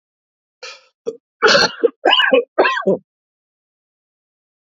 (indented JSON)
{
  "three_cough_length": "4.6 s",
  "three_cough_amplitude": 32768,
  "three_cough_signal_mean_std_ratio": 0.4,
  "survey_phase": "alpha (2021-03-01 to 2021-08-12)",
  "age": "18-44",
  "gender": "Male",
  "wearing_mask": "No",
  "symptom_cough_any": true,
  "symptom_fatigue": true,
  "symptom_headache": true,
  "symptom_change_to_sense_of_smell_or_taste": true,
  "symptom_onset": "4 days",
  "smoker_status": "Never smoked",
  "respiratory_condition_asthma": false,
  "respiratory_condition_other": false,
  "recruitment_source": "Test and Trace",
  "submission_delay": "2 days",
  "covid_test_result": "Positive",
  "covid_test_method": "RT-qPCR",
  "covid_ct_value": 17.7,
  "covid_ct_gene": "S gene",
  "covid_ct_mean": 18.1,
  "covid_viral_load": "1100000 copies/ml",
  "covid_viral_load_category": "High viral load (>1M copies/ml)"
}